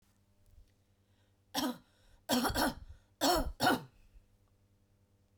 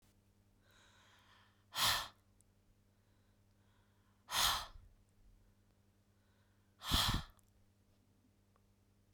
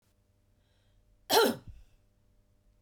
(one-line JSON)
{"three_cough_length": "5.4 s", "three_cough_amplitude": 5483, "three_cough_signal_mean_std_ratio": 0.39, "exhalation_length": "9.1 s", "exhalation_amplitude": 3656, "exhalation_signal_mean_std_ratio": 0.3, "cough_length": "2.8 s", "cough_amplitude": 8929, "cough_signal_mean_std_ratio": 0.25, "survey_phase": "beta (2021-08-13 to 2022-03-07)", "age": "45-64", "gender": "Female", "wearing_mask": "No", "symptom_none": true, "smoker_status": "Never smoked", "respiratory_condition_asthma": false, "respiratory_condition_other": false, "recruitment_source": "REACT", "submission_delay": "1 day", "covid_test_result": "Negative", "covid_test_method": "RT-qPCR", "influenza_a_test_result": "Unknown/Void", "influenza_b_test_result": "Unknown/Void"}